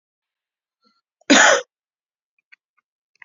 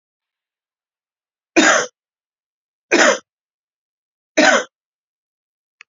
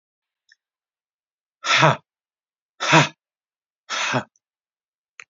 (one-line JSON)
{"cough_length": "3.2 s", "cough_amplitude": 30446, "cough_signal_mean_std_ratio": 0.25, "three_cough_length": "5.9 s", "three_cough_amplitude": 32767, "three_cough_signal_mean_std_ratio": 0.29, "exhalation_length": "5.3 s", "exhalation_amplitude": 28159, "exhalation_signal_mean_std_ratio": 0.29, "survey_phase": "beta (2021-08-13 to 2022-03-07)", "age": "45-64", "gender": "Male", "wearing_mask": "No", "symptom_cough_any": true, "symptom_onset": "12 days", "smoker_status": "Never smoked", "respiratory_condition_asthma": true, "respiratory_condition_other": false, "recruitment_source": "REACT", "submission_delay": "2 days", "covid_test_result": "Negative", "covid_test_method": "RT-qPCR"}